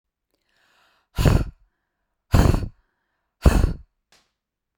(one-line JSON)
{"exhalation_length": "4.8 s", "exhalation_amplitude": 26889, "exhalation_signal_mean_std_ratio": 0.32, "survey_phase": "beta (2021-08-13 to 2022-03-07)", "age": "18-44", "gender": "Female", "wearing_mask": "No", "symptom_cough_any": true, "symptom_onset": "7 days", "smoker_status": "Never smoked", "respiratory_condition_asthma": true, "respiratory_condition_other": false, "recruitment_source": "REACT", "submission_delay": "1 day", "covid_test_result": "Negative", "covid_test_method": "RT-qPCR"}